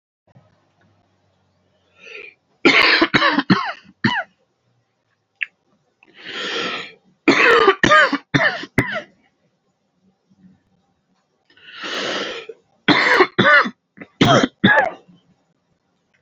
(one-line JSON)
{"three_cough_length": "16.2 s", "three_cough_amplitude": 30392, "three_cough_signal_mean_std_ratio": 0.4, "survey_phase": "beta (2021-08-13 to 2022-03-07)", "age": "18-44", "gender": "Male", "wearing_mask": "No", "symptom_cough_any": true, "symptom_runny_or_blocked_nose": true, "symptom_sore_throat": true, "symptom_headache": true, "symptom_onset": "3 days", "smoker_status": "Never smoked", "respiratory_condition_asthma": true, "respiratory_condition_other": false, "recruitment_source": "REACT", "submission_delay": "1 day", "covid_test_result": "Positive", "covid_test_method": "RT-qPCR", "covid_ct_value": 19.0, "covid_ct_gene": "E gene", "influenza_a_test_result": "Negative", "influenza_b_test_result": "Negative"}